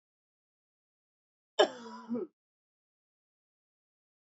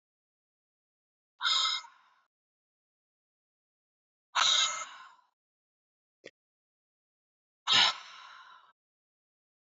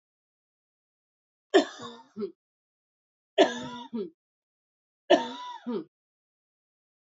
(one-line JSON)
{"cough_length": "4.3 s", "cough_amplitude": 11440, "cough_signal_mean_std_ratio": 0.18, "exhalation_length": "9.6 s", "exhalation_amplitude": 8747, "exhalation_signal_mean_std_ratio": 0.28, "three_cough_length": "7.2 s", "three_cough_amplitude": 16136, "three_cough_signal_mean_std_ratio": 0.25, "survey_phase": "beta (2021-08-13 to 2022-03-07)", "age": "18-44", "gender": "Female", "wearing_mask": "No", "symptom_runny_or_blocked_nose": true, "symptom_onset": "12 days", "smoker_status": "Ex-smoker", "respiratory_condition_asthma": false, "respiratory_condition_other": false, "recruitment_source": "REACT", "submission_delay": "1 day", "covid_test_result": "Negative", "covid_test_method": "RT-qPCR", "influenza_a_test_result": "Unknown/Void", "influenza_b_test_result": "Unknown/Void"}